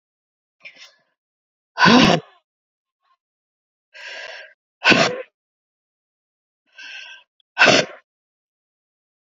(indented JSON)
{
  "exhalation_length": "9.4 s",
  "exhalation_amplitude": 29278,
  "exhalation_signal_mean_std_ratio": 0.27,
  "survey_phase": "alpha (2021-03-01 to 2021-08-12)",
  "age": "45-64",
  "gender": "Female",
  "wearing_mask": "No",
  "symptom_cough_any": true,
  "symptom_new_continuous_cough": true,
  "symptom_shortness_of_breath": true,
  "symptom_diarrhoea": true,
  "symptom_fatigue": true,
  "symptom_fever_high_temperature": true,
  "symptom_headache": true,
  "symptom_change_to_sense_of_smell_or_taste": true,
  "symptom_loss_of_taste": true,
  "smoker_status": "Ex-smoker",
  "respiratory_condition_asthma": true,
  "respiratory_condition_other": true,
  "recruitment_source": "Test and Trace",
  "submission_delay": "4 days",
  "covid_test_result": "Positive",
  "covid_test_method": "LFT"
}